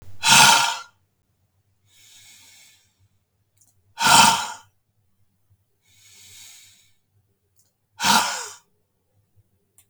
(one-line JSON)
{"exhalation_length": "9.9 s", "exhalation_amplitude": 32766, "exhalation_signal_mean_std_ratio": 0.29, "survey_phase": "beta (2021-08-13 to 2022-03-07)", "age": "45-64", "gender": "Male", "wearing_mask": "No", "symptom_cough_any": true, "symptom_runny_or_blocked_nose": true, "symptom_onset": "4 days", "smoker_status": "Never smoked", "respiratory_condition_asthma": false, "respiratory_condition_other": false, "recruitment_source": "Test and Trace", "submission_delay": "3 days", "covid_test_result": "Positive", "covid_test_method": "RT-qPCR", "covid_ct_value": 34.1, "covid_ct_gene": "N gene"}